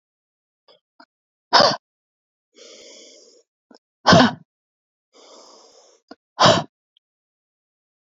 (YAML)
exhalation_length: 8.1 s
exhalation_amplitude: 29934
exhalation_signal_mean_std_ratio: 0.23
survey_phase: beta (2021-08-13 to 2022-03-07)
age: 45-64
gender: Female
wearing_mask: 'No'
symptom_none: true
smoker_status: Ex-smoker
respiratory_condition_asthma: false
respiratory_condition_other: false
recruitment_source: REACT
submission_delay: 1 day
covid_test_result: Negative
covid_test_method: RT-qPCR
influenza_a_test_result: Negative
influenza_b_test_result: Negative